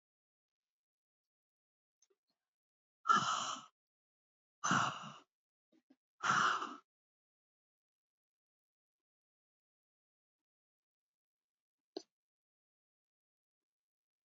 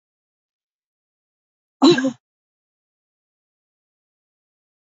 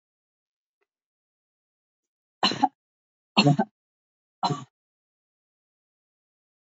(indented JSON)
{
  "exhalation_length": "14.3 s",
  "exhalation_amplitude": 4124,
  "exhalation_signal_mean_std_ratio": 0.23,
  "cough_length": "4.9 s",
  "cough_amplitude": 26718,
  "cough_signal_mean_std_ratio": 0.18,
  "three_cough_length": "6.7 s",
  "three_cough_amplitude": 22067,
  "three_cough_signal_mean_std_ratio": 0.21,
  "survey_phase": "beta (2021-08-13 to 2022-03-07)",
  "age": "65+",
  "gender": "Female",
  "wearing_mask": "No",
  "symptom_cough_any": true,
  "symptom_onset": "12 days",
  "smoker_status": "Never smoked",
  "respiratory_condition_asthma": false,
  "respiratory_condition_other": false,
  "recruitment_source": "REACT",
  "submission_delay": "2 days",
  "covid_test_result": "Positive",
  "covid_test_method": "RT-qPCR",
  "covid_ct_value": 20.0,
  "covid_ct_gene": "E gene",
  "influenza_a_test_result": "Negative",
  "influenza_b_test_result": "Negative"
}